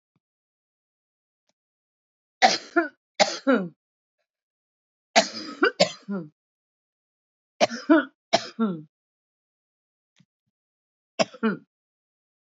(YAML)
three_cough_length: 12.5 s
three_cough_amplitude: 25067
three_cough_signal_mean_std_ratio: 0.27
survey_phase: beta (2021-08-13 to 2022-03-07)
age: 45-64
gender: Female
wearing_mask: 'Yes'
symptom_cough_any: true
symptom_runny_or_blocked_nose: true
symptom_fatigue: true
symptom_headache: true
symptom_loss_of_taste: true
symptom_other: true
smoker_status: Current smoker (e-cigarettes or vapes only)
respiratory_condition_asthma: false
respiratory_condition_other: false
recruitment_source: Test and Trace
submission_delay: 2 days
covid_test_result: Positive
covid_test_method: RT-qPCR
covid_ct_value: 19.3
covid_ct_gene: ORF1ab gene
covid_ct_mean: 19.7
covid_viral_load: 350000 copies/ml
covid_viral_load_category: Low viral load (10K-1M copies/ml)